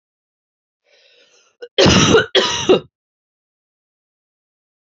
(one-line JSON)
{"cough_length": "4.9 s", "cough_amplitude": 31076, "cough_signal_mean_std_ratio": 0.34, "survey_phase": "beta (2021-08-13 to 2022-03-07)", "age": "45-64", "gender": "Female", "wearing_mask": "No", "symptom_runny_or_blocked_nose": true, "symptom_headache": true, "symptom_change_to_sense_of_smell_or_taste": true, "symptom_onset": "4 days", "smoker_status": "Never smoked", "respiratory_condition_asthma": false, "respiratory_condition_other": false, "recruitment_source": "Test and Trace", "submission_delay": "2 days", "covid_test_result": "Positive", "covid_test_method": "ePCR"}